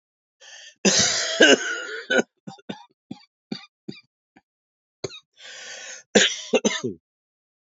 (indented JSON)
{
  "cough_length": "7.8 s",
  "cough_amplitude": 29435,
  "cough_signal_mean_std_ratio": 0.36,
  "survey_phase": "alpha (2021-03-01 to 2021-08-12)",
  "age": "45-64",
  "gender": "Female",
  "wearing_mask": "No",
  "symptom_cough_any": true,
  "symptom_fatigue": true,
  "symptom_fever_high_temperature": true,
  "symptom_headache": true,
  "symptom_change_to_sense_of_smell_or_taste": true,
  "symptom_loss_of_taste": true,
  "symptom_onset": "3 days",
  "smoker_status": "Never smoked",
  "respiratory_condition_asthma": false,
  "respiratory_condition_other": false,
  "recruitment_source": "Test and Trace",
  "submission_delay": "2 days",
  "covid_test_result": "Positive",
  "covid_test_method": "RT-qPCR"
}